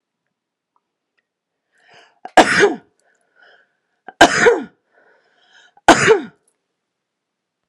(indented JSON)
{
  "three_cough_length": "7.7 s",
  "three_cough_amplitude": 32768,
  "three_cough_signal_mean_std_ratio": 0.28,
  "survey_phase": "alpha (2021-03-01 to 2021-08-12)",
  "age": "45-64",
  "gender": "Female",
  "wearing_mask": "No",
  "symptom_none": true,
  "smoker_status": "Never smoked",
  "respiratory_condition_asthma": false,
  "respiratory_condition_other": false,
  "recruitment_source": "REACT",
  "submission_delay": "18 days",
  "covid_test_result": "Negative",
  "covid_test_method": "RT-qPCR"
}